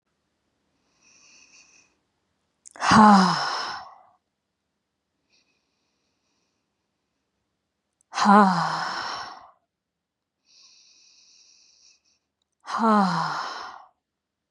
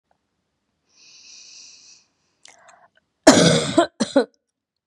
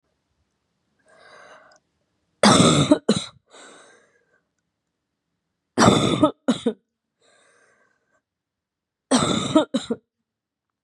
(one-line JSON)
{"exhalation_length": "14.5 s", "exhalation_amplitude": 28635, "exhalation_signal_mean_std_ratio": 0.3, "cough_length": "4.9 s", "cough_amplitude": 32768, "cough_signal_mean_std_ratio": 0.29, "three_cough_length": "10.8 s", "three_cough_amplitude": 28525, "three_cough_signal_mean_std_ratio": 0.32, "survey_phase": "beta (2021-08-13 to 2022-03-07)", "age": "18-44", "gender": "Female", "wearing_mask": "No", "symptom_sore_throat": true, "symptom_headache": true, "smoker_status": "Ex-smoker", "respiratory_condition_asthma": false, "respiratory_condition_other": false, "recruitment_source": "Test and Trace", "submission_delay": "2 days", "covid_test_result": "Positive", "covid_test_method": "RT-qPCR", "covid_ct_value": 24.2, "covid_ct_gene": "ORF1ab gene"}